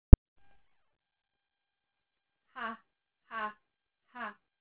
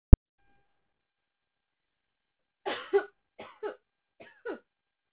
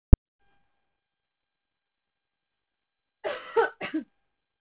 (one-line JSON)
{"exhalation_length": "4.6 s", "exhalation_amplitude": 32080, "exhalation_signal_mean_std_ratio": 0.07, "three_cough_length": "5.1 s", "three_cough_amplitude": 32080, "three_cough_signal_mean_std_ratio": 0.1, "cough_length": "4.6 s", "cough_amplitude": 32080, "cough_signal_mean_std_ratio": 0.12, "survey_phase": "beta (2021-08-13 to 2022-03-07)", "age": "18-44", "gender": "Female", "wearing_mask": "No", "symptom_fatigue": true, "symptom_headache": true, "smoker_status": "Never smoked", "respiratory_condition_asthma": false, "respiratory_condition_other": false, "recruitment_source": "Test and Trace", "submission_delay": "2 days", "covid_test_result": "Positive", "covid_test_method": "RT-qPCR"}